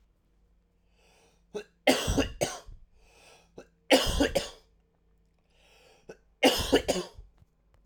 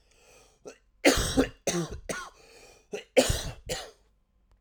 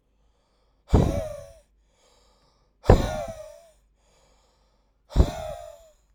{"three_cough_length": "7.9 s", "three_cough_amplitude": 16644, "three_cough_signal_mean_std_ratio": 0.35, "cough_length": "4.6 s", "cough_amplitude": 15406, "cough_signal_mean_std_ratio": 0.39, "exhalation_length": "6.1 s", "exhalation_amplitude": 31435, "exhalation_signal_mean_std_ratio": 0.29, "survey_phase": "alpha (2021-03-01 to 2021-08-12)", "age": "18-44", "gender": "Male", "wearing_mask": "No", "symptom_cough_any": true, "symptom_shortness_of_breath": true, "symptom_fatigue": true, "symptom_headache": true, "symptom_onset": "3 days", "smoker_status": "Never smoked", "respiratory_condition_asthma": false, "respiratory_condition_other": false, "recruitment_source": "Test and Trace", "submission_delay": "1 day", "covid_test_result": "Positive", "covid_test_method": "RT-qPCR"}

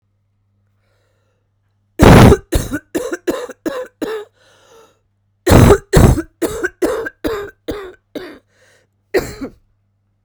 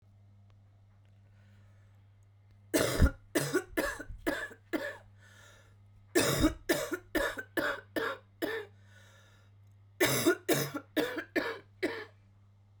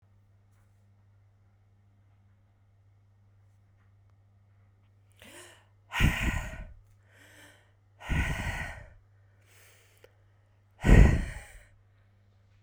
{"cough_length": "10.2 s", "cough_amplitude": 32768, "cough_signal_mean_std_ratio": 0.36, "three_cough_length": "12.8 s", "three_cough_amplitude": 7749, "three_cough_signal_mean_std_ratio": 0.46, "exhalation_length": "12.6 s", "exhalation_amplitude": 18481, "exhalation_signal_mean_std_ratio": 0.25, "survey_phase": "beta (2021-08-13 to 2022-03-07)", "age": "45-64", "gender": "Female", "wearing_mask": "No", "symptom_cough_any": true, "symptom_runny_or_blocked_nose": true, "symptom_shortness_of_breath": true, "symptom_abdominal_pain": true, "symptom_headache": true, "symptom_onset": "6 days", "smoker_status": "Never smoked", "respiratory_condition_asthma": false, "respiratory_condition_other": false, "recruitment_source": "Test and Trace", "submission_delay": "1 day", "covid_test_result": "Positive", "covid_test_method": "RT-qPCR", "covid_ct_value": 15.5, "covid_ct_gene": "ORF1ab gene", "covid_ct_mean": 17.2, "covid_viral_load": "2300000 copies/ml", "covid_viral_load_category": "High viral load (>1M copies/ml)"}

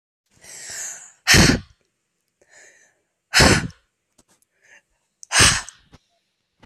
{"exhalation_length": "6.7 s", "exhalation_amplitude": 32768, "exhalation_signal_mean_std_ratio": 0.31, "survey_phase": "beta (2021-08-13 to 2022-03-07)", "age": "18-44", "gender": "Female", "wearing_mask": "No", "symptom_cough_any": true, "symptom_runny_or_blocked_nose": true, "symptom_fatigue": true, "symptom_headache": true, "symptom_other": true, "smoker_status": "Never smoked", "respiratory_condition_asthma": false, "respiratory_condition_other": false, "recruitment_source": "Test and Trace", "submission_delay": "2 days", "covid_test_result": "Positive", "covid_test_method": "RT-qPCR", "covid_ct_value": 19.3, "covid_ct_gene": "N gene", "covid_ct_mean": 19.9, "covid_viral_load": "300000 copies/ml", "covid_viral_load_category": "Low viral load (10K-1M copies/ml)"}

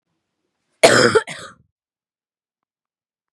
{"cough_length": "3.3 s", "cough_amplitude": 32768, "cough_signal_mean_std_ratio": 0.26, "survey_phase": "beta (2021-08-13 to 2022-03-07)", "age": "18-44", "gender": "Female", "wearing_mask": "No", "symptom_cough_any": true, "symptom_runny_or_blocked_nose": true, "symptom_sore_throat": true, "symptom_fatigue": true, "symptom_headache": true, "smoker_status": "Current smoker (1 to 10 cigarettes per day)", "respiratory_condition_asthma": false, "respiratory_condition_other": false, "recruitment_source": "REACT", "submission_delay": "2 days", "covid_test_result": "Positive", "covid_test_method": "RT-qPCR", "covid_ct_value": 20.0, "covid_ct_gene": "E gene", "influenza_a_test_result": "Negative", "influenza_b_test_result": "Negative"}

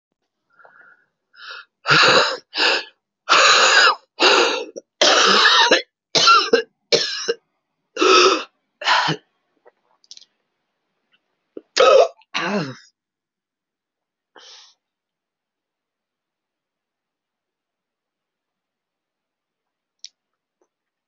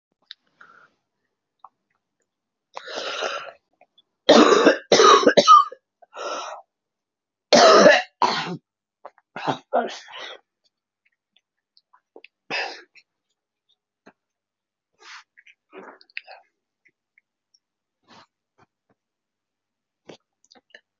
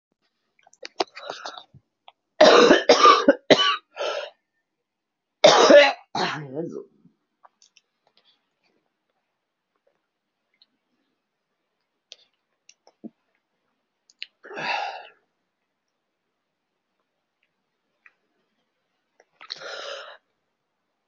{"exhalation_length": "21.1 s", "exhalation_amplitude": 28516, "exhalation_signal_mean_std_ratio": 0.38, "three_cough_length": "21.0 s", "three_cough_amplitude": 29538, "three_cough_signal_mean_std_ratio": 0.27, "cough_length": "21.1 s", "cough_amplitude": 31026, "cough_signal_mean_std_ratio": 0.25, "survey_phase": "alpha (2021-03-01 to 2021-08-12)", "age": "18-44", "gender": "Female", "wearing_mask": "No", "symptom_cough_any": true, "symptom_fatigue": true, "symptom_fever_high_temperature": true, "symptom_headache": true, "symptom_change_to_sense_of_smell_or_taste": true, "symptom_loss_of_taste": true, "symptom_onset": "5 days", "smoker_status": "Current smoker (1 to 10 cigarettes per day)", "respiratory_condition_asthma": false, "respiratory_condition_other": false, "recruitment_source": "Test and Trace", "submission_delay": "2 days", "covid_test_result": "Positive", "covid_test_method": "RT-qPCR", "covid_ct_value": 17.5, "covid_ct_gene": "S gene", "covid_ct_mean": 17.9, "covid_viral_load": "1400000 copies/ml", "covid_viral_load_category": "High viral load (>1M copies/ml)"}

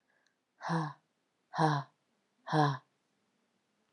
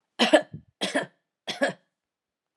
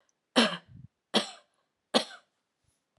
{"exhalation_length": "3.9 s", "exhalation_amplitude": 6149, "exhalation_signal_mean_std_ratio": 0.35, "cough_length": "2.6 s", "cough_amplitude": 23404, "cough_signal_mean_std_ratio": 0.33, "three_cough_length": "3.0 s", "three_cough_amplitude": 16733, "three_cough_signal_mean_std_ratio": 0.27, "survey_phase": "alpha (2021-03-01 to 2021-08-12)", "age": "18-44", "gender": "Female", "wearing_mask": "No", "symptom_none": true, "smoker_status": "Never smoked", "respiratory_condition_asthma": false, "respiratory_condition_other": false, "recruitment_source": "REACT", "submission_delay": "1 day", "covid_test_result": "Negative", "covid_test_method": "RT-qPCR"}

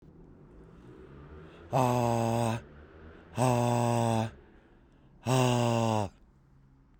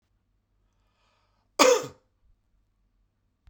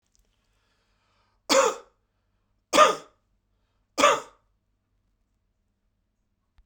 {"exhalation_length": "7.0 s", "exhalation_amplitude": 8495, "exhalation_signal_mean_std_ratio": 0.52, "cough_length": "3.5 s", "cough_amplitude": 27873, "cough_signal_mean_std_ratio": 0.21, "three_cough_length": "6.7 s", "three_cough_amplitude": 22911, "three_cough_signal_mean_std_ratio": 0.24, "survey_phase": "beta (2021-08-13 to 2022-03-07)", "age": "45-64", "gender": "Male", "wearing_mask": "No", "symptom_none": true, "smoker_status": "Current smoker (1 to 10 cigarettes per day)", "respiratory_condition_asthma": false, "respiratory_condition_other": false, "recruitment_source": "REACT", "submission_delay": "2 days", "covid_test_result": "Negative", "covid_test_method": "RT-qPCR"}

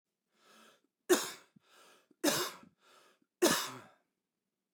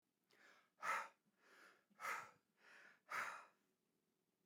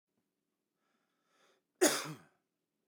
{"three_cough_length": "4.7 s", "three_cough_amplitude": 7011, "three_cough_signal_mean_std_ratio": 0.3, "exhalation_length": "4.5 s", "exhalation_amplitude": 904, "exhalation_signal_mean_std_ratio": 0.38, "cough_length": "2.9 s", "cough_amplitude": 6157, "cough_signal_mean_std_ratio": 0.21, "survey_phase": "beta (2021-08-13 to 2022-03-07)", "age": "45-64", "gender": "Male", "wearing_mask": "No", "symptom_none": true, "smoker_status": "Ex-smoker", "respiratory_condition_asthma": false, "respiratory_condition_other": false, "recruitment_source": "REACT", "submission_delay": "2 days", "covid_test_result": "Negative", "covid_test_method": "RT-qPCR"}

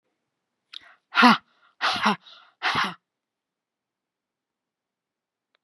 {"exhalation_length": "5.6 s", "exhalation_amplitude": 27639, "exhalation_signal_mean_std_ratio": 0.27, "survey_phase": "beta (2021-08-13 to 2022-03-07)", "age": "65+", "gender": "Female", "wearing_mask": "No", "symptom_none": true, "smoker_status": "Ex-smoker", "respiratory_condition_asthma": false, "respiratory_condition_other": false, "recruitment_source": "REACT", "submission_delay": "2 days", "covid_test_result": "Negative", "covid_test_method": "RT-qPCR", "influenza_a_test_result": "Negative", "influenza_b_test_result": "Negative"}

